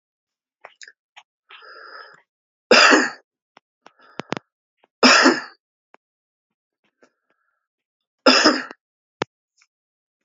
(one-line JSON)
{"three_cough_length": "10.2 s", "three_cough_amplitude": 32767, "three_cough_signal_mean_std_ratio": 0.26, "survey_phase": "beta (2021-08-13 to 2022-03-07)", "age": "45-64", "gender": "Male", "wearing_mask": "No", "symptom_cough_any": true, "symptom_headache": true, "smoker_status": "Ex-smoker", "respiratory_condition_asthma": false, "respiratory_condition_other": false, "recruitment_source": "Test and Trace", "submission_delay": "2 days", "covid_test_result": "Positive", "covid_test_method": "RT-qPCR"}